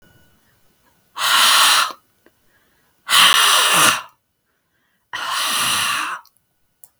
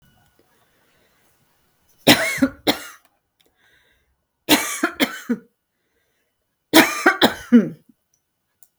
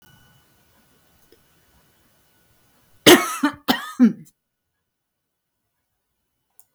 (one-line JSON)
{"exhalation_length": "7.0 s", "exhalation_amplitude": 32768, "exhalation_signal_mean_std_ratio": 0.5, "three_cough_length": "8.8 s", "three_cough_amplitude": 32768, "three_cough_signal_mean_std_ratio": 0.3, "cough_length": "6.7 s", "cough_amplitude": 32768, "cough_signal_mean_std_ratio": 0.21, "survey_phase": "beta (2021-08-13 to 2022-03-07)", "age": "65+", "gender": "Female", "wearing_mask": "No", "symptom_none": true, "smoker_status": "Never smoked", "respiratory_condition_asthma": false, "respiratory_condition_other": false, "recruitment_source": "REACT", "submission_delay": "2 days", "covid_test_result": "Negative", "covid_test_method": "RT-qPCR", "influenza_a_test_result": "Negative", "influenza_b_test_result": "Negative"}